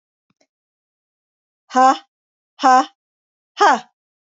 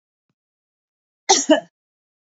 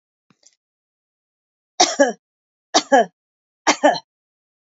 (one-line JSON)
{"exhalation_length": "4.3 s", "exhalation_amplitude": 28768, "exhalation_signal_mean_std_ratio": 0.3, "cough_length": "2.2 s", "cough_amplitude": 29688, "cough_signal_mean_std_ratio": 0.25, "three_cough_length": "4.6 s", "three_cough_amplitude": 32767, "three_cough_signal_mean_std_ratio": 0.29, "survey_phase": "beta (2021-08-13 to 2022-03-07)", "age": "45-64", "gender": "Female", "wearing_mask": "No", "symptom_none": true, "smoker_status": "Never smoked", "respiratory_condition_asthma": false, "respiratory_condition_other": false, "recruitment_source": "Test and Trace", "submission_delay": "3 days", "covid_test_result": "Positive", "covid_test_method": "RT-qPCR", "covid_ct_value": 23.2, "covid_ct_gene": "N gene"}